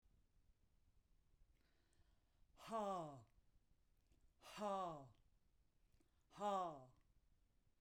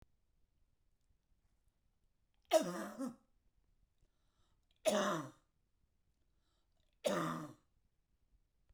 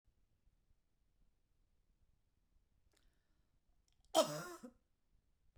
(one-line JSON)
{"exhalation_length": "7.8 s", "exhalation_amplitude": 709, "exhalation_signal_mean_std_ratio": 0.39, "three_cough_length": "8.7 s", "three_cough_amplitude": 3636, "three_cough_signal_mean_std_ratio": 0.29, "cough_length": "5.6 s", "cough_amplitude": 4032, "cough_signal_mean_std_ratio": 0.18, "survey_phase": "beta (2021-08-13 to 2022-03-07)", "age": "65+", "gender": "Female", "wearing_mask": "No", "symptom_none": true, "smoker_status": "Never smoked", "respiratory_condition_asthma": false, "respiratory_condition_other": false, "recruitment_source": "REACT", "submission_delay": "2 days", "covid_test_result": "Negative", "covid_test_method": "RT-qPCR"}